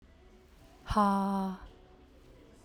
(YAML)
exhalation_length: 2.6 s
exhalation_amplitude: 6328
exhalation_signal_mean_std_ratio: 0.47
survey_phase: beta (2021-08-13 to 2022-03-07)
age: 45-64
gender: Female
wearing_mask: 'No'
symptom_none: true
smoker_status: Ex-smoker
respiratory_condition_asthma: false
respiratory_condition_other: false
recruitment_source: REACT
submission_delay: 4 days
covid_test_result: Negative
covid_test_method: RT-qPCR
covid_ct_value: 46.0
covid_ct_gene: N gene